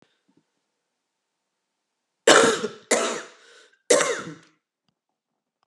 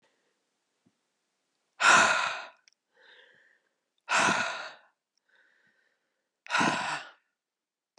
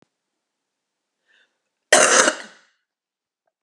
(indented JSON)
{
  "three_cough_length": "5.7 s",
  "three_cough_amplitude": 32768,
  "three_cough_signal_mean_std_ratio": 0.3,
  "exhalation_length": "8.0 s",
  "exhalation_amplitude": 13368,
  "exhalation_signal_mean_std_ratio": 0.33,
  "cough_length": "3.6 s",
  "cough_amplitude": 32767,
  "cough_signal_mean_std_ratio": 0.26,
  "survey_phase": "beta (2021-08-13 to 2022-03-07)",
  "age": "45-64",
  "gender": "Female",
  "wearing_mask": "No",
  "symptom_cough_any": true,
  "symptom_sore_throat": true,
  "symptom_fatigue": true,
  "symptom_headache": true,
  "symptom_other": true,
  "symptom_onset": "10 days",
  "smoker_status": "Never smoked",
  "respiratory_condition_asthma": false,
  "respiratory_condition_other": false,
  "recruitment_source": "REACT",
  "submission_delay": "1 day",
  "covid_test_result": "Negative",
  "covid_test_method": "RT-qPCR"
}